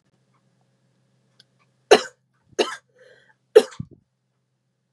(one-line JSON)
{"three_cough_length": "4.9 s", "three_cough_amplitude": 32766, "three_cough_signal_mean_std_ratio": 0.16, "survey_phase": "beta (2021-08-13 to 2022-03-07)", "age": "18-44", "gender": "Female", "wearing_mask": "No", "symptom_cough_any": true, "symptom_onset": "9 days", "smoker_status": "Never smoked", "respiratory_condition_asthma": false, "respiratory_condition_other": false, "recruitment_source": "REACT", "submission_delay": "2 days", "covid_test_result": "Negative", "covid_test_method": "RT-qPCR", "influenza_a_test_result": "Negative", "influenza_b_test_result": "Negative"}